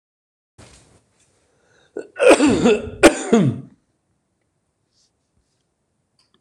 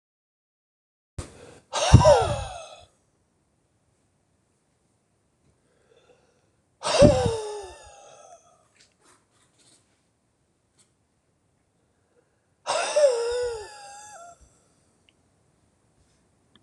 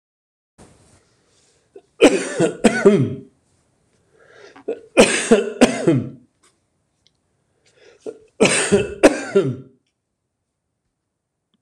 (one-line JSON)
{"cough_length": "6.4 s", "cough_amplitude": 26028, "cough_signal_mean_std_ratio": 0.32, "exhalation_length": "16.6 s", "exhalation_amplitude": 26027, "exhalation_signal_mean_std_ratio": 0.27, "three_cough_length": "11.6 s", "three_cough_amplitude": 26028, "three_cough_signal_mean_std_ratio": 0.35, "survey_phase": "beta (2021-08-13 to 2022-03-07)", "age": "65+", "gender": "Male", "wearing_mask": "No", "symptom_none": true, "smoker_status": "Ex-smoker", "respiratory_condition_asthma": false, "respiratory_condition_other": true, "recruitment_source": "REACT", "submission_delay": "2 days", "covid_test_result": "Negative", "covid_test_method": "RT-qPCR"}